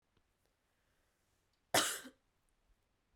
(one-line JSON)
{"cough_length": "3.2 s", "cough_amplitude": 5247, "cough_signal_mean_std_ratio": 0.21, "survey_phase": "beta (2021-08-13 to 2022-03-07)", "age": "18-44", "gender": "Female", "wearing_mask": "No", "symptom_cough_any": true, "symptom_runny_or_blocked_nose": true, "symptom_shortness_of_breath": true, "symptom_headache": true, "symptom_change_to_sense_of_smell_or_taste": true, "symptom_loss_of_taste": true, "symptom_other": true, "symptom_onset": "6 days", "smoker_status": "Never smoked", "respiratory_condition_asthma": false, "respiratory_condition_other": false, "recruitment_source": "Test and Trace", "submission_delay": "2 days", "covid_test_result": "Positive", "covid_test_method": "RT-qPCR", "covid_ct_value": 17.2, "covid_ct_gene": "ORF1ab gene"}